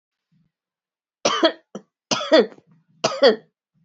{"three_cough_length": "3.8 s", "three_cough_amplitude": 24776, "three_cough_signal_mean_std_ratio": 0.34, "survey_phase": "beta (2021-08-13 to 2022-03-07)", "age": "18-44", "gender": "Female", "wearing_mask": "Yes", "symptom_runny_or_blocked_nose": true, "symptom_change_to_sense_of_smell_or_taste": true, "symptom_onset": "6 days", "smoker_status": "Never smoked", "respiratory_condition_asthma": false, "respiratory_condition_other": false, "recruitment_source": "Test and Trace", "submission_delay": "2 days", "covid_test_result": "Positive", "covid_test_method": "RT-qPCR", "covid_ct_value": 26.0, "covid_ct_gene": "ORF1ab gene", "covid_ct_mean": 26.4, "covid_viral_load": "2200 copies/ml", "covid_viral_load_category": "Minimal viral load (< 10K copies/ml)"}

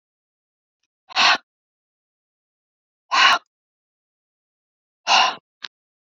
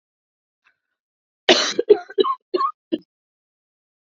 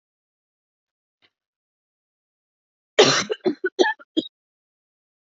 {"exhalation_length": "6.1 s", "exhalation_amplitude": 25305, "exhalation_signal_mean_std_ratio": 0.27, "cough_length": "4.0 s", "cough_amplitude": 29597, "cough_signal_mean_std_ratio": 0.29, "three_cough_length": "5.3 s", "three_cough_amplitude": 29096, "three_cough_signal_mean_std_ratio": 0.25, "survey_phase": "beta (2021-08-13 to 2022-03-07)", "age": "45-64", "gender": "Female", "wearing_mask": "No", "symptom_cough_any": true, "symptom_fatigue": true, "symptom_headache": true, "symptom_onset": "1 day", "smoker_status": "Never smoked", "respiratory_condition_asthma": false, "respiratory_condition_other": false, "recruitment_source": "Test and Trace", "submission_delay": "1 day", "covid_test_result": "Negative", "covid_test_method": "RT-qPCR"}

